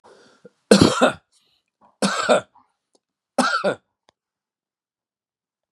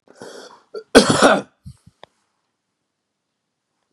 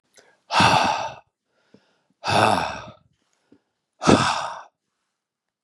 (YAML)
three_cough_length: 5.7 s
three_cough_amplitude: 32768
three_cough_signal_mean_std_ratio: 0.31
cough_length: 3.9 s
cough_amplitude: 32768
cough_signal_mean_std_ratio: 0.26
exhalation_length: 5.6 s
exhalation_amplitude: 32765
exhalation_signal_mean_std_ratio: 0.4
survey_phase: beta (2021-08-13 to 2022-03-07)
age: 45-64
gender: Male
wearing_mask: 'No'
symptom_runny_or_blocked_nose: true
symptom_onset: 13 days
smoker_status: Ex-smoker
respiratory_condition_asthma: false
respiratory_condition_other: false
recruitment_source: REACT
submission_delay: 2 days
covid_test_result: Negative
covid_test_method: RT-qPCR
influenza_a_test_result: Negative
influenza_b_test_result: Negative